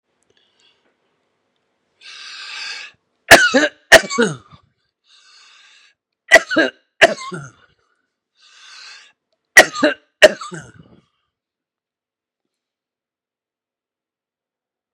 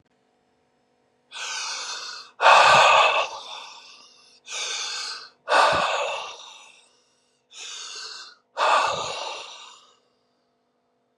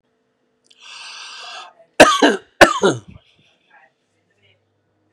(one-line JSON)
{"three_cough_length": "14.9 s", "three_cough_amplitude": 32768, "three_cough_signal_mean_std_ratio": 0.23, "exhalation_length": "11.2 s", "exhalation_amplitude": 28158, "exhalation_signal_mean_std_ratio": 0.43, "cough_length": "5.1 s", "cough_amplitude": 32768, "cough_signal_mean_std_ratio": 0.27, "survey_phase": "beta (2021-08-13 to 2022-03-07)", "age": "18-44", "gender": "Male", "wearing_mask": "No", "symptom_none": true, "smoker_status": "Never smoked", "respiratory_condition_asthma": false, "respiratory_condition_other": false, "recruitment_source": "REACT", "submission_delay": "2 days", "covid_test_result": "Negative", "covid_test_method": "RT-qPCR", "influenza_a_test_result": "Negative", "influenza_b_test_result": "Negative"}